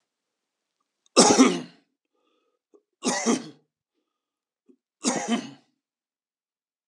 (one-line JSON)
{"three_cough_length": "6.9 s", "three_cough_amplitude": 26305, "three_cough_signal_mean_std_ratio": 0.29, "survey_phase": "beta (2021-08-13 to 2022-03-07)", "age": "65+", "gender": "Male", "wearing_mask": "No", "symptom_none": true, "smoker_status": "Ex-smoker", "respiratory_condition_asthma": false, "respiratory_condition_other": false, "recruitment_source": "REACT", "submission_delay": "1 day", "covid_test_result": "Negative", "covid_test_method": "RT-qPCR"}